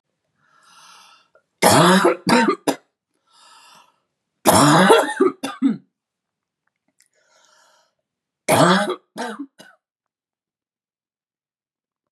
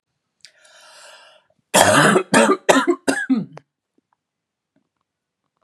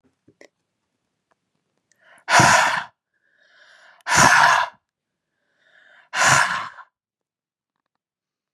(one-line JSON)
{"three_cough_length": "12.1 s", "three_cough_amplitude": 32768, "three_cough_signal_mean_std_ratio": 0.36, "cough_length": "5.6 s", "cough_amplitude": 32768, "cough_signal_mean_std_ratio": 0.38, "exhalation_length": "8.5 s", "exhalation_amplitude": 31243, "exhalation_signal_mean_std_ratio": 0.34, "survey_phase": "beta (2021-08-13 to 2022-03-07)", "age": "18-44", "gender": "Female", "wearing_mask": "No", "symptom_cough_any": true, "symptom_runny_or_blocked_nose": true, "symptom_fatigue": true, "symptom_headache": true, "symptom_onset": "6 days", "smoker_status": "Ex-smoker", "respiratory_condition_asthma": false, "respiratory_condition_other": false, "recruitment_source": "Test and Trace", "submission_delay": "1 day", "covid_test_result": "Positive", "covid_test_method": "ePCR"}